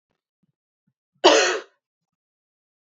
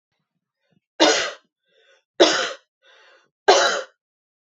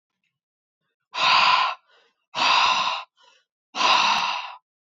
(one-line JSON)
{"cough_length": "3.0 s", "cough_amplitude": 27665, "cough_signal_mean_std_ratio": 0.25, "three_cough_length": "4.4 s", "three_cough_amplitude": 29322, "three_cough_signal_mean_std_ratio": 0.34, "exhalation_length": "4.9 s", "exhalation_amplitude": 16950, "exhalation_signal_mean_std_ratio": 0.53, "survey_phase": "beta (2021-08-13 to 2022-03-07)", "age": "18-44", "gender": "Female", "wearing_mask": "No", "symptom_none": true, "smoker_status": "Never smoked", "respiratory_condition_asthma": true, "respiratory_condition_other": false, "recruitment_source": "REACT", "submission_delay": "2 days", "covid_test_result": "Negative", "covid_test_method": "RT-qPCR", "influenza_a_test_result": "Negative", "influenza_b_test_result": "Negative"}